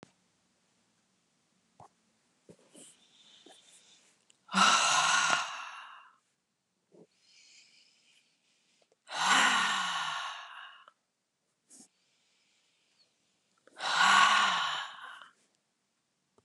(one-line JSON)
{"exhalation_length": "16.4 s", "exhalation_amplitude": 11732, "exhalation_signal_mean_std_ratio": 0.36, "survey_phase": "beta (2021-08-13 to 2022-03-07)", "age": "65+", "gender": "Female", "wearing_mask": "No", "symptom_none": true, "smoker_status": "Ex-smoker", "respiratory_condition_asthma": false, "respiratory_condition_other": false, "recruitment_source": "REACT", "submission_delay": "7 days", "covid_test_result": "Negative", "covid_test_method": "RT-qPCR", "influenza_a_test_result": "Negative", "influenza_b_test_result": "Negative"}